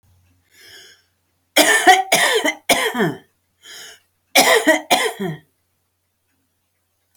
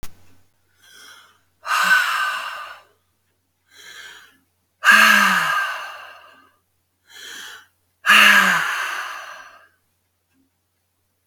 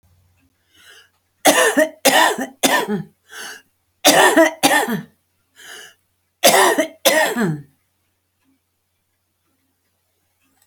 {"cough_length": "7.2 s", "cough_amplitude": 32767, "cough_signal_mean_std_ratio": 0.42, "exhalation_length": "11.3 s", "exhalation_amplitude": 30739, "exhalation_signal_mean_std_ratio": 0.4, "three_cough_length": "10.7 s", "three_cough_amplitude": 32768, "three_cough_signal_mean_std_ratio": 0.42, "survey_phase": "alpha (2021-03-01 to 2021-08-12)", "age": "45-64", "gender": "Female", "wearing_mask": "No", "symptom_none": true, "smoker_status": "Ex-smoker", "respiratory_condition_asthma": false, "respiratory_condition_other": false, "recruitment_source": "REACT", "submission_delay": "2 days", "covid_test_result": "Negative", "covid_test_method": "RT-qPCR"}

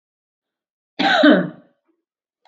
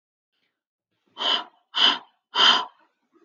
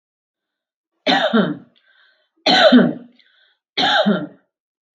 {"cough_length": "2.5 s", "cough_amplitude": 29217, "cough_signal_mean_std_ratio": 0.35, "exhalation_length": "3.2 s", "exhalation_amplitude": 18730, "exhalation_signal_mean_std_ratio": 0.37, "three_cough_length": "4.9 s", "three_cough_amplitude": 32768, "three_cough_signal_mean_std_ratio": 0.43, "survey_phase": "beta (2021-08-13 to 2022-03-07)", "age": "45-64", "gender": "Female", "wearing_mask": "No", "symptom_none": true, "smoker_status": "Never smoked", "respiratory_condition_asthma": false, "respiratory_condition_other": false, "recruitment_source": "REACT", "submission_delay": "5 days", "covid_test_result": "Negative", "covid_test_method": "RT-qPCR", "influenza_a_test_result": "Negative", "influenza_b_test_result": "Negative"}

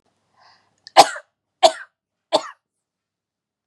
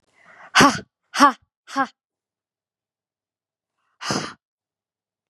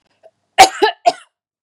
{"three_cough_length": "3.7 s", "three_cough_amplitude": 32768, "three_cough_signal_mean_std_ratio": 0.19, "exhalation_length": "5.3 s", "exhalation_amplitude": 32617, "exhalation_signal_mean_std_ratio": 0.25, "cough_length": "1.6 s", "cough_amplitude": 32768, "cough_signal_mean_std_ratio": 0.31, "survey_phase": "beta (2021-08-13 to 2022-03-07)", "age": "18-44", "gender": "Female", "wearing_mask": "No", "symptom_fatigue": true, "symptom_loss_of_taste": true, "smoker_status": "Ex-smoker", "respiratory_condition_asthma": false, "respiratory_condition_other": false, "recruitment_source": "REACT", "submission_delay": "2 days", "covid_test_result": "Negative", "covid_test_method": "RT-qPCR", "influenza_a_test_result": "Negative", "influenza_b_test_result": "Negative"}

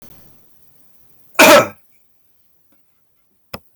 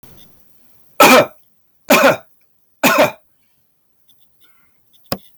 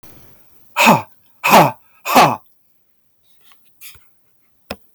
{"cough_length": "3.8 s", "cough_amplitude": 32768, "cough_signal_mean_std_ratio": 0.26, "three_cough_length": "5.4 s", "three_cough_amplitude": 32768, "three_cough_signal_mean_std_ratio": 0.34, "exhalation_length": "4.9 s", "exhalation_amplitude": 32768, "exhalation_signal_mean_std_ratio": 0.34, "survey_phase": "beta (2021-08-13 to 2022-03-07)", "age": "65+", "gender": "Male", "wearing_mask": "No", "symptom_none": true, "smoker_status": "Never smoked", "respiratory_condition_asthma": false, "respiratory_condition_other": false, "recruitment_source": "REACT", "submission_delay": "2 days", "covid_test_result": "Negative", "covid_test_method": "RT-qPCR", "influenza_a_test_result": "Negative", "influenza_b_test_result": "Negative"}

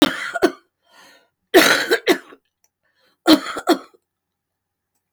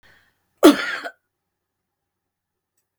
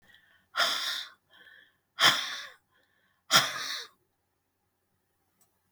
{"three_cough_length": "5.1 s", "three_cough_amplitude": 32768, "three_cough_signal_mean_std_ratio": 0.34, "cough_length": "3.0 s", "cough_amplitude": 32768, "cough_signal_mean_std_ratio": 0.2, "exhalation_length": "5.7 s", "exhalation_amplitude": 14318, "exhalation_signal_mean_std_ratio": 0.33, "survey_phase": "beta (2021-08-13 to 2022-03-07)", "age": "65+", "gender": "Female", "wearing_mask": "No", "symptom_cough_any": true, "symptom_runny_or_blocked_nose": true, "symptom_sore_throat": true, "symptom_onset": "11 days", "smoker_status": "Never smoked", "respiratory_condition_asthma": true, "respiratory_condition_other": true, "recruitment_source": "REACT", "submission_delay": "3 days", "covid_test_result": "Negative", "covid_test_method": "RT-qPCR", "influenza_a_test_result": "Unknown/Void", "influenza_b_test_result": "Unknown/Void"}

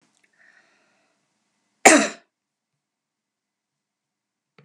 {"cough_length": "4.6 s", "cough_amplitude": 32768, "cough_signal_mean_std_ratio": 0.16, "survey_phase": "beta (2021-08-13 to 2022-03-07)", "age": "65+", "gender": "Female", "wearing_mask": "No", "symptom_none": true, "smoker_status": "Never smoked", "respiratory_condition_asthma": false, "respiratory_condition_other": false, "recruitment_source": "REACT", "submission_delay": "2 days", "covid_test_result": "Negative", "covid_test_method": "RT-qPCR"}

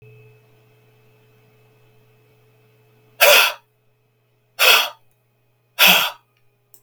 {"exhalation_length": "6.8 s", "exhalation_amplitude": 32768, "exhalation_signal_mean_std_ratio": 0.29, "survey_phase": "beta (2021-08-13 to 2022-03-07)", "age": "65+", "gender": "Male", "wearing_mask": "No", "symptom_none": true, "smoker_status": "Ex-smoker", "respiratory_condition_asthma": false, "respiratory_condition_other": false, "recruitment_source": "REACT", "submission_delay": "4 days", "covid_test_result": "Negative", "covid_test_method": "RT-qPCR"}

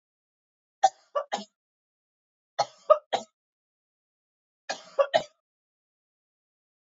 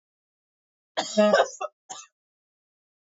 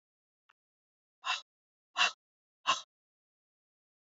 {"three_cough_length": "6.9 s", "three_cough_amplitude": 19721, "three_cough_signal_mean_std_ratio": 0.2, "cough_length": "3.2 s", "cough_amplitude": 17054, "cough_signal_mean_std_ratio": 0.3, "exhalation_length": "4.1 s", "exhalation_amplitude": 6231, "exhalation_signal_mean_std_ratio": 0.22, "survey_phase": "beta (2021-08-13 to 2022-03-07)", "age": "18-44", "gender": "Female", "wearing_mask": "No", "symptom_cough_any": true, "symptom_runny_or_blocked_nose": true, "symptom_sore_throat": true, "symptom_fatigue": true, "symptom_headache": true, "symptom_other": true, "smoker_status": "Never smoked", "respiratory_condition_asthma": false, "respiratory_condition_other": false, "recruitment_source": "Test and Trace", "submission_delay": "2 days", "covid_test_result": "Positive", "covid_test_method": "RT-qPCR", "covid_ct_value": 17.9, "covid_ct_gene": "ORF1ab gene"}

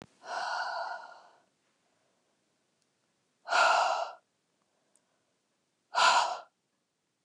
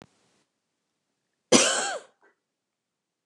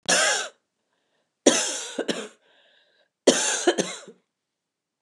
{"exhalation_length": "7.2 s", "exhalation_amplitude": 8855, "exhalation_signal_mean_std_ratio": 0.36, "cough_length": "3.3 s", "cough_amplitude": 23234, "cough_signal_mean_std_ratio": 0.26, "three_cough_length": "5.0 s", "three_cough_amplitude": 27364, "three_cough_signal_mean_std_ratio": 0.4, "survey_phase": "beta (2021-08-13 to 2022-03-07)", "age": "45-64", "gender": "Female", "wearing_mask": "No", "symptom_cough_any": true, "symptom_new_continuous_cough": true, "symptom_sore_throat": true, "symptom_onset": "4 days", "smoker_status": "Ex-smoker", "respiratory_condition_asthma": false, "respiratory_condition_other": false, "recruitment_source": "Test and Trace", "submission_delay": "1 day", "covid_test_result": "Positive", "covid_test_method": "RT-qPCR", "covid_ct_value": 28.2, "covid_ct_gene": "ORF1ab gene", "covid_ct_mean": 28.4, "covid_viral_load": "500 copies/ml", "covid_viral_load_category": "Minimal viral load (< 10K copies/ml)"}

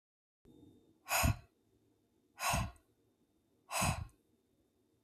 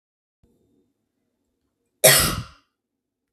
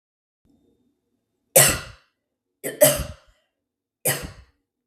{"exhalation_length": "5.0 s", "exhalation_amplitude": 3496, "exhalation_signal_mean_std_ratio": 0.34, "cough_length": "3.3 s", "cough_amplitude": 32768, "cough_signal_mean_std_ratio": 0.24, "three_cough_length": "4.9 s", "three_cough_amplitude": 32768, "three_cough_signal_mean_std_ratio": 0.26, "survey_phase": "beta (2021-08-13 to 2022-03-07)", "age": "18-44", "gender": "Female", "wearing_mask": "No", "symptom_none": true, "smoker_status": "Never smoked", "respiratory_condition_asthma": false, "respiratory_condition_other": false, "recruitment_source": "REACT", "submission_delay": "1 day", "covid_test_result": "Negative", "covid_test_method": "RT-qPCR", "influenza_a_test_result": "Negative", "influenza_b_test_result": "Negative"}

